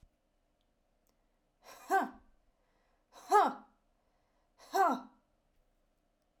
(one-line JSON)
{"exhalation_length": "6.4 s", "exhalation_amplitude": 7000, "exhalation_signal_mean_std_ratio": 0.26, "survey_phase": "alpha (2021-03-01 to 2021-08-12)", "age": "18-44", "gender": "Female", "wearing_mask": "No", "symptom_none": true, "smoker_status": "Never smoked", "respiratory_condition_asthma": true, "respiratory_condition_other": false, "recruitment_source": "REACT", "submission_delay": "1 day", "covid_test_result": "Negative", "covid_test_method": "RT-qPCR"}